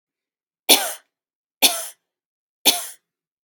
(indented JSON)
{
  "three_cough_length": "3.4 s",
  "three_cough_amplitude": 32768,
  "three_cough_signal_mean_std_ratio": 0.27,
  "survey_phase": "beta (2021-08-13 to 2022-03-07)",
  "age": "45-64",
  "gender": "Female",
  "wearing_mask": "No",
  "symptom_none": true,
  "smoker_status": "Never smoked",
  "respiratory_condition_asthma": false,
  "respiratory_condition_other": false,
  "recruitment_source": "REACT",
  "submission_delay": "1 day",
  "covid_test_result": "Negative",
  "covid_test_method": "RT-qPCR",
  "influenza_a_test_result": "Negative",
  "influenza_b_test_result": "Negative"
}